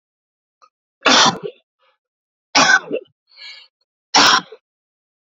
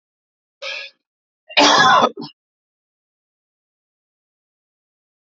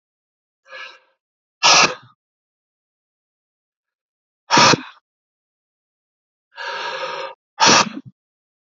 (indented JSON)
{
  "three_cough_length": "5.4 s",
  "three_cough_amplitude": 32285,
  "three_cough_signal_mean_std_ratio": 0.34,
  "cough_length": "5.3 s",
  "cough_amplitude": 31041,
  "cough_signal_mean_std_ratio": 0.28,
  "exhalation_length": "8.8 s",
  "exhalation_amplitude": 32036,
  "exhalation_signal_mean_std_ratio": 0.29,
  "survey_phase": "alpha (2021-03-01 to 2021-08-12)",
  "age": "45-64",
  "gender": "Male",
  "wearing_mask": "No",
  "symptom_none": true,
  "smoker_status": "Ex-smoker",
  "respiratory_condition_asthma": false,
  "respiratory_condition_other": false,
  "recruitment_source": "REACT",
  "submission_delay": "1 day",
  "covid_test_result": "Negative",
  "covid_test_method": "RT-qPCR"
}